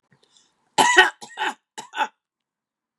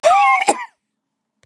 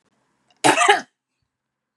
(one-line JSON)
{"three_cough_length": "3.0 s", "three_cough_amplitude": 32767, "three_cough_signal_mean_std_ratio": 0.31, "exhalation_length": "1.5 s", "exhalation_amplitude": 31346, "exhalation_signal_mean_std_ratio": 0.53, "cough_length": "2.0 s", "cough_amplitude": 31061, "cough_signal_mean_std_ratio": 0.32, "survey_phase": "beta (2021-08-13 to 2022-03-07)", "age": "45-64", "gender": "Female", "wearing_mask": "No", "symptom_none": true, "smoker_status": "Never smoked", "respiratory_condition_asthma": false, "respiratory_condition_other": false, "recruitment_source": "REACT", "submission_delay": "1 day", "covid_test_method": "RT-qPCR", "covid_ct_value": 35.0, "covid_ct_gene": "N gene", "influenza_a_test_result": "Unknown/Void", "influenza_b_test_result": "Unknown/Void"}